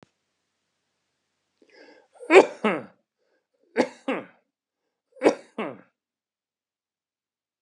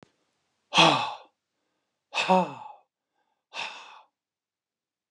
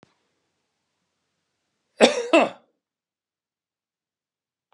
{
  "three_cough_length": "7.6 s",
  "three_cough_amplitude": 29677,
  "three_cough_signal_mean_std_ratio": 0.2,
  "exhalation_length": "5.1 s",
  "exhalation_amplitude": 18235,
  "exhalation_signal_mean_std_ratio": 0.29,
  "cough_length": "4.7 s",
  "cough_amplitude": 32768,
  "cough_signal_mean_std_ratio": 0.2,
  "survey_phase": "beta (2021-08-13 to 2022-03-07)",
  "age": "65+",
  "gender": "Male",
  "wearing_mask": "No",
  "symptom_none": true,
  "smoker_status": "Never smoked",
  "respiratory_condition_asthma": false,
  "respiratory_condition_other": false,
  "recruitment_source": "REACT",
  "submission_delay": "1 day",
  "covid_test_result": "Negative",
  "covid_test_method": "RT-qPCR"
}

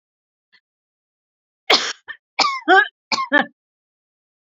{
  "cough_length": "4.4 s",
  "cough_amplitude": 29564,
  "cough_signal_mean_std_ratio": 0.32,
  "survey_phase": "beta (2021-08-13 to 2022-03-07)",
  "age": "45-64",
  "gender": "Female",
  "wearing_mask": "No",
  "symptom_none": true,
  "symptom_onset": "13 days",
  "smoker_status": "Ex-smoker",
  "respiratory_condition_asthma": false,
  "respiratory_condition_other": true,
  "recruitment_source": "REACT",
  "submission_delay": "15 days",
  "covid_test_result": "Negative",
  "covid_test_method": "RT-qPCR",
  "influenza_a_test_result": "Negative",
  "influenza_b_test_result": "Negative"
}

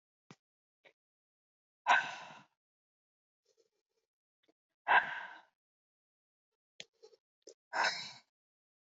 {
  "exhalation_length": "9.0 s",
  "exhalation_amplitude": 6497,
  "exhalation_signal_mean_std_ratio": 0.22,
  "survey_phase": "beta (2021-08-13 to 2022-03-07)",
  "age": "18-44",
  "gender": "Female",
  "wearing_mask": "No",
  "symptom_cough_any": true,
  "symptom_new_continuous_cough": true,
  "symptom_runny_or_blocked_nose": true,
  "symptom_shortness_of_breath": true,
  "symptom_fatigue": true,
  "symptom_onset": "12 days",
  "smoker_status": "Never smoked",
  "respiratory_condition_asthma": false,
  "respiratory_condition_other": false,
  "recruitment_source": "REACT",
  "submission_delay": "1 day",
  "covid_test_result": "Positive",
  "covid_test_method": "RT-qPCR",
  "covid_ct_value": 30.3,
  "covid_ct_gene": "E gene",
  "influenza_a_test_result": "Negative",
  "influenza_b_test_result": "Negative"
}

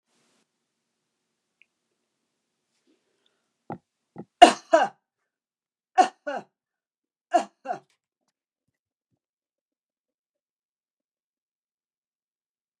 {
  "three_cough_length": "12.8 s",
  "three_cough_amplitude": 32768,
  "three_cough_signal_mean_std_ratio": 0.14,
  "survey_phase": "alpha (2021-03-01 to 2021-08-12)",
  "age": "65+",
  "gender": "Female",
  "wearing_mask": "No",
  "symptom_cough_any": true,
  "smoker_status": "Never smoked",
  "respiratory_condition_asthma": false,
  "respiratory_condition_other": false,
  "recruitment_source": "REACT",
  "submission_delay": "2 days",
  "covid_test_result": "Negative",
  "covid_test_method": "RT-qPCR"
}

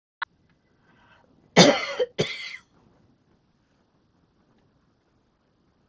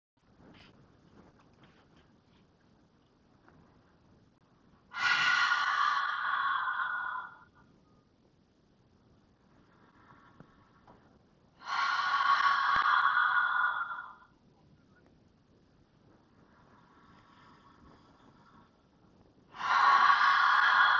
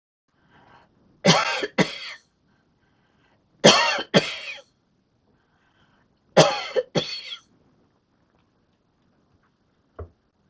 {
  "cough_length": "5.9 s",
  "cough_amplitude": 30124,
  "cough_signal_mean_std_ratio": 0.22,
  "exhalation_length": "21.0 s",
  "exhalation_amplitude": 9165,
  "exhalation_signal_mean_std_ratio": 0.46,
  "three_cough_length": "10.5 s",
  "three_cough_amplitude": 31022,
  "three_cough_signal_mean_std_ratio": 0.28,
  "survey_phase": "beta (2021-08-13 to 2022-03-07)",
  "age": "65+",
  "gender": "Female",
  "wearing_mask": "No",
  "symptom_none": true,
  "smoker_status": "Never smoked",
  "respiratory_condition_asthma": false,
  "respiratory_condition_other": false,
  "recruitment_source": "REACT",
  "submission_delay": "2 days",
  "covid_test_result": "Negative",
  "covid_test_method": "RT-qPCR"
}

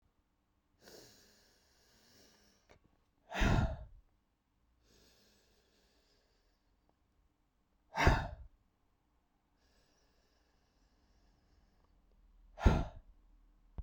{
  "exhalation_length": "13.8 s",
  "exhalation_amplitude": 7372,
  "exhalation_signal_mean_std_ratio": 0.22,
  "survey_phase": "beta (2021-08-13 to 2022-03-07)",
  "age": "45-64",
  "gender": "Female",
  "wearing_mask": "No",
  "symptom_none": true,
  "symptom_onset": "4 days",
  "smoker_status": "Ex-smoker",
  "respiratory_condition_asthma": false,
  "respiratory_condition_other": false,
  "recruitment_source": "REACT",
  "submission_delay": "3 days",
  "covid_test_result": "Negative",
  "covid_test_method": "RT-qPCR"
}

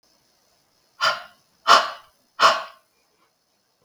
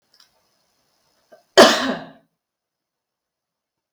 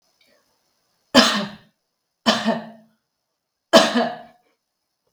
{
  "exhalation_length": "3.8 s",
  "exhalation_amplitude": 32766,
  "exhalation_signal_mean_std_ratio": 0.29,
  "cough_length": "3.9 s",
  "cough_amplitude": 32768,
  "cough_signal_mean_std_ratio": 0.21,
  "three_cough_length": "5.1 s",
  "three_cough_amplitude": 32768,
  "three_cough_signal_mean_std_ratio": 0.32,
  "survey_phase": "beta (2021-08-13 to 2022-03-07)",
  "age": "45-64",
  "gender": "Female",
  "wearing_mask": "No",
  "symptom_none": true,
  "smoker_status": "Never smoked",
  "respiratory_condition_asthma": false,
  "respiratory_condition_other": false,
  "recruitment_source": "REACT",
  "submission_delay": "2 days",
  "covid_test_result": "Negative",
  "covid_test_method": "RT-qPCR"
}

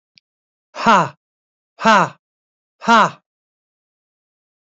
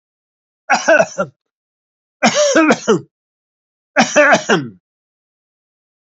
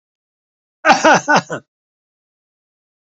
{
  "exhalation_length": "4.7 s",
  "exhalation_amplitude": 27842,
  "exhalation_signal_mean_std_ratio": 0.29,
  "three_cough_length": "6.1 s",
  "three_cough_amplitude": 30283,
  "three_cough_signal_mean_std_ratio": 0.42,
  "cough_length": "3.2 s",
  "cough_amplitude": 32768,
  "cough_signal_mean_std_ratio": 0.31,
  "survey_phase": "beta (2021-08-13 to 2022-03-07)",
  "age": "65+",
  "gender": "Male",
  "wearing_mask": "No",
  "symptom_none": true,
  "symptom_onset": "9 days",
  "smoker_status": "Ex-smoker",
  "respiratory_condition_asthma": false,
  "respiratory_condition_other": false,
  "recruitment_source": "REACT",
  "submission_delay": "2 days",
  "covid_test_result": "Negative",
  "covid_test_method": "RT-qPCR"
}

